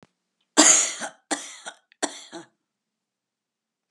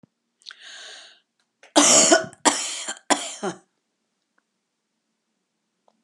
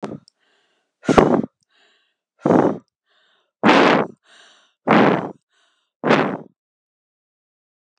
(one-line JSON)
{"three_cough_length": "3.9 s", "three_cough_amplitude": 31439, "three_cough_signal_mean_std_ratio": 0.28, "cough_length": "6.0 s", "cough_amplitude": 30585, "cough_signal_mean_std_ratio": 0.31, "exhalation_length": "8.0 s", "exhalation_amplitude": 32768, "exhalation_signal_mean_std_ratio": 0.37, "survey_phase": "alpha (2021-03-01 to 2021-08-12)", "age": "65+", "gender": "Female", "wearing_mask": "No", "symptom_none": true, "smoker_status": "Never smoked", "respiratory_condition_asthma": false, "respiratory_condition_other": false, "recruitment_source": "REACT", "submission_delay": "1 day", "covid_test_result": "Negative", "covid_test_method": "RT-qPCR"}